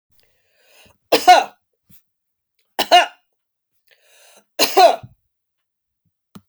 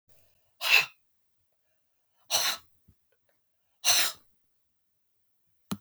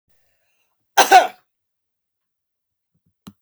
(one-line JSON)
{"three_cough_length": "6.5 s", "three_cough_amplitude": 32768, "three_cough_signal_mean_std_ratio": 0.27, "exhalation_length": "5.8 s", "exhalation_amplitude": 14827, "exhalation_signal_mean_std_ratio": 0.29, "cough_length": "3.4 s", "cough_amplitude": 32768, "cough_signal_mean_std_ratio": 0.21, "survey_phase": "beta (2021-08-13 to 2022-03-07)", "age": "45-64", "gender": "Female", "wearing_mask": "No", "symptom_cough_any": true, "symptom_runny_or_blocked_nose": true, "symptom_sore_throat": true, "symptom_headache": true, "symptom_change_to_sense_of_smell_or_taste": true, "smoker_status": "Ex-smoker", "respiratory_condition_asthma": false, "respiratory_condition_other": false, "recruitment_source": "Test and Trace", "submission_delay": "2 days", "covid_test_result": "Positive", "covid_test_method": "RT-qPCR"}